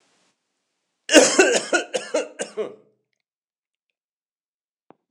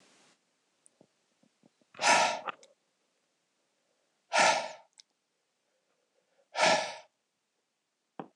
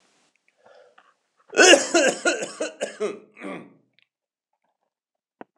three_cough_length: 5.1 s
three_cough_amplitude: 26028
three_cough_signal_mean_std_ratio: 0.31
exhalation_length: 8.4 s
exhalation_amplitude: 9485
exhalation_signal_mean_std_ratio: 0.29
cough_length: 5.6 s
cough_amplitude: 26028
cough_signal_mean_std_ratio: 0.31
survey_phase: beta (2021-08-13 to 2022-03-07)
age: 45-64
gender: Male
wearing_mask: 'No'
symptom_none: true
smoker_status: Never smoked
respiratory_condition_asthma: false
respiratory_condition_other: false
recruitment_source: REACT
submission_delay: 1 day
covid_test_result: Negative
covid_test_method: RT-qPCR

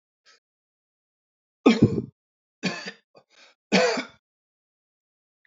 three_cough_length: 5.5 s
three_cough_amplitude: 19775
three_cough_signal_mean_std_ratio: 0.27
survey_phase: alpha (2021-03-01 to 2021-08-12)
age: 45-64
gender: Male
wearing_mask: 'No'
symptom_none: true
smoker_status: Ex-smoker
respiratory_condition_asthma: false
respiratory_condition_other: false
recruitment_source: REACT
submission_delay: 2 days
covid_test_result: Negative
covid_test_method: RT-qPCR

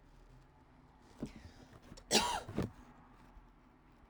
cough_length: 4.1 s
cough_amplitude: 6525
cough_signal_mean_std_ratio: 0.36
survey_phase: alpha (2021-03-01 to 2021-08-12)
age: 18-44
gender: Female
wearing_mask: 'No'
symptom_cough_any: true
symptom_fatigue: true
symptom_headache: true
smoker_status: Never smoked
respiratory_condition_asthma: false
respiratory_condition_other: false
recruitment_source: Test and Trace
submission_delay: 1 day
covid_test_result: Positive
covid_test_method: RT-qPCR
covid_ct_value: 17.3
covid_ct_gene: ORF1ab gene
covid_ct_mean: 18.6
covid_viral_load: 800000 copies/ml
covid_viral_load_category: Low viral load (10K-1M copies/ml)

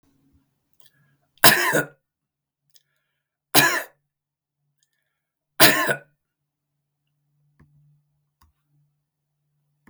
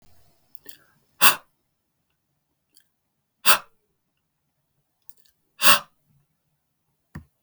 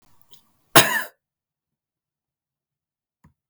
three_cough_length: 9.9 s
three_cough_amplitude: 32768
three_cough_signal_mean_std_ratio: 0.22
exhalation_length: 7.4 s
exhalation_amplitude: 32768
exhalation_signal_mean_std_ratio: 0.18
cough_length: 3.5 s
cough_amplitude: 32768
cough_signal_mean_std_ratio: 0.18
survey_phase: beta (2021-08-13 to 2022-03-07)
age: 45-64
gender: Male
wearing_mask: 'No'
symptom_runny_or_blocked_nose: true
symptom_abdominal_pain: true
smoker_status: Never smoked
respiratory_condition_asthma: false
respiratory_condition_other: false
recruitment_source: REACT
submission_delay: 3 days
covid_test_result: Negative
covid_test_method: RT-qPCR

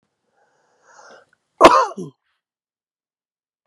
cough_length: 3.7 s
cough_amplitude: 32768
cough_signal_mean_std_ratio: 0.21
survey_phase: beta (2021-08-13 to 2022-03-07)
age: 18-44
gender: Male
wearing_mask: 'No'
symptom_cough_any: true
symptom_new_continuous_cough: true
symptom_runny_or_blocked_nose: true
symptom_fatigue: true
symptom_fever_high_temperature: true
symptom_change_to_sense_of_smell_or_taste: true
symptom_onset: 4 days
smoker_status: Never smoked
respiratory_condition_asthma: false
respiratory_condition_other: false
recruitment_source: Test and Trace
submission_delay: 2 days
covid_test_result: Positive
covid_test_method: RT-qPCR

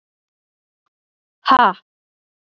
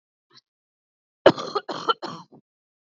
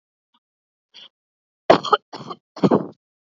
exhalation_length: 2.6 s
exhalation_amplitude: 27937
exhalation_signal_mean_std_ratio: 0.23
cough_length: 3.0 s
cough_amplitude: 26625
cough_signal_mean_std_ratio: 0.22
three_cough_length: 3.3 s
three_cough_amplitude: 32767
three_cough_signal_mean_std_ratio: 0.25
survey_phase: beta (2021-08-13 to 2022-03-07)
age: 18-44
gender: Female
wearing_mask: 'No'
symptom_none: true
smoker_status: Never smoked
respiratory_condition_asthma: false
respiratory_condition_other: false
recruitment_source: REACT
submission_delay: 3 days
covid_test_result: Negative
covid_test_method: RT-qPCR
influenza_a_test_result: Negative
influenza_b_test_result: Negative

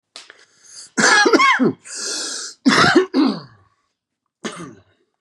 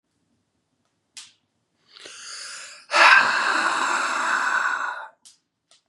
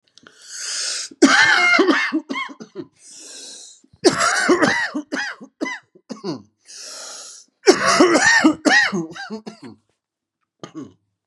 cough_length: 5.2 s
cough_amplitude: 30066
cough_signal_mean_std_ratio: 0.5
exhalation_length: 5.9 s
exhalation_amplitude: 28348
exhalation_signal_mean_std_ratio: 0.47
three_cough_length: 11.3 s
three_cough_amplitude: 32700
three_cough_signal_mean_std_ratio: 0.51
survey_phase: beta (2021-08-13 to 2022-03-07)
age: 18-44
gender: Male
wearing_mask: 'No'
symptom_cough_any: true
symptom_runny_or_blocked_nose: true
symptom_shortness_of_breath: true
symptom_sore_throat: true
symptom_fatigue: true
smoker_status: Ex-smoker
respiratory_condition_asthma: false
respiratory_condition_other: false
recruitment_source: Test and Trace
submission_delay: 2 days
covid_test_result: Positive
covid_test_method: LFT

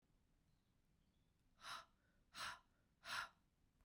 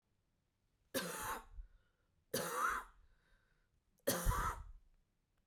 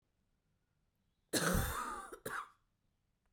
exhalation_length: 3.8 s
exhalation_amplitude: 534
exhalation_signal_mean_std_ratio: 0.38
three_cough_length: 5.5 s
three_cough_amplitude: 2338
three_cough_signal_mean_std_ratio: 0.44
cough_length: 3.3 s
cough_amplitude: 3320
cough_signal_mean_std_ratio: 0.41
survey_phase: beta (2021-08-13 to 2022-03-07)
age: 45-64
gender: Female
wearing_mask: 'No'
symptom_new_continuous_cough: true
symptom_runny_or_blocked_nose: true
symptom_sore_throat: true
symptom_fatigue: true
symptom_headache: true
symptom_change_to_sense_of_smell_or_taste: true
symptom_onset: 4 days
smoker_status: Never smoked
respiratory_condition_asthma: false
respiratory_condition_other: false
recruitment_source: Test and Trace
submission_delay: 2 days
covid_test_result: Positive
covid_test_method: RT-qPCR
covid_ct_value: 28.9
covid_ct_gene: ORF1ab gene
covid_ct_mean: 29.7
covid_viral_load: 180 copies/ml
covid_viral_load_category: Minimal viral load (< 10K copies/ml)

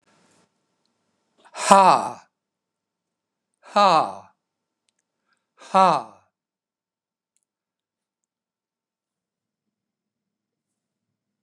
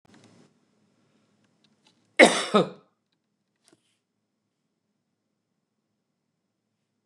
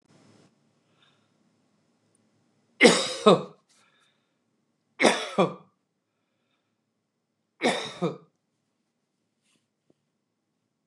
exhalation_length: 11.4 s
exhalation_amplitude: 29204
exhalation_signal_mean_std_ratio: 0.21
cough_length: 7.1 s
cough_amplitude: 29204
cough_signal_mean_std_ratio: 0.16
three_cough_length: 10.9 s
three_cough_amplitude: 28209
three_cough_signal_mean_std_ratio: 0.23
survey_phase: beta (2021-08-13 to 2022-03-07)
age: 65+
gender: Male
wearing_mask: 'No'
symptom_none: true
smoker_status: Ex-smoker
respiratory_condition_asthma: false
respiratory_condition_other: false
recruitment_source: REACT
submission_delay: 1 day
covid_test_result: Negative
covid_test_method: RT-qPCR
influenza_a_test_result: Negative
influenza_b_test_result: Negative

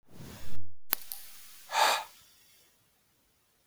exhalation_length: 3.7 s
exhalation_amplitude: 32768
exhalation_signal_mean_std_ratio: 0.46
survey_phase: beta (2021-08-13 to 2022-03-07)
age: 18-44
gender: Male
wearing_mask: 'No'
symptom_cough_any: true
symptom_fatigue: true
symptom_headache: true
symptom_change_to_sense_of_smell_or_taste: true
symptom_loss_of_taste: true
symptom_onset: 5 days
smoker_status: Never smoked
respiratory_condition_asthma: false
respiratory_condition_other: false
recruitment_source: Test and Trace
submission_delay: 1 day
covid_test_result: Positive
covid_test_method: RT-qPCR
covid_ct_value: 29.7
covid_ct_gene: ORF1ab gene
covid_ct_mean: 30.1
covid_viral_load: 130 copies/ml
covid_viral_load_category: Minimal viral load (< 10K copies/ml)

